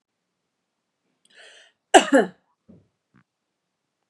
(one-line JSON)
{"cough_length": "4.1 s", "cough_amplitude": 32767, "cough_signal_mean_std_ratio": 0.18, "survey_phase": "beta (2021-08-13 to 2022-03-07)", "age": "45-64", "gender": "Female", "wearing_mask": "No", "symptom_none": true, "smoker_status": "Never smoked", "respiratory_condition_asthma": false, "respiratory_condition_other": false, "recruitment_source": "REACT", "submission_delay": "0 days", "covid_test_result": "Negative", "covid_test_method": "RT-qPCR", "influenza_a_test_result": "Negative", "influenza_b_test_result": "Negative"}